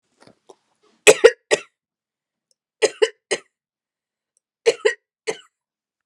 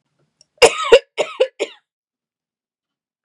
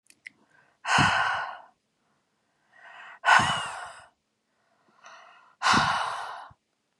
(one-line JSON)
{"three_cough_length": "6.1 s", "three_cough_amplitude": 32768, "three_cough_signal_mean_std_ratio": 0.21, "cough_length": "3.2 s", "cough_amplitude": 32768, "cough_signal_mean_std_ratio": 0.26, "exhalation_length": "7.0 s", "exhalation_amplitude": 21683, "exhalation_signal_mean_std_ratio": 0.4, "survey_phase": "beta (2021-08-13 to 2022-03-07)", "age": "18-44", "gender": "Female", "wearing_mask": "No", "symptom_none": true, "smoker_status": "Never smoked", "respiratory_condition_asthma": false, "respiratory_condition_other": false, "recruitment_source": "REACT", "submission_delay": "2 days", "covid_test_result": "Negative", "covid_test_method": "RT-qPCR", "influenza_a_test_result": "Negative", "influenza_b_test_result": "Negative"}